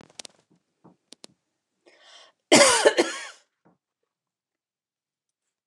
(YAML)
cough_length: 5.7 s
cough_amplitude: 26333
cough_signal_mean_std_ratio: 0.24
survey_phase: beta (2021-08-13 to 2022-03-07)
age: 65+
gender: Female
wearing_mask: 'No'
symptom_none: true
smoker_status: Ex-smoker
respiratory_condition_asthma: false
respiratory_condition_other: false
recruitment_source: REACT
submission_delay: 5 days
covid_test_result: Negative
covid_test_method: RT-qPCR
influenza_a_test_result: Negative
influenza_b_test_result: Negative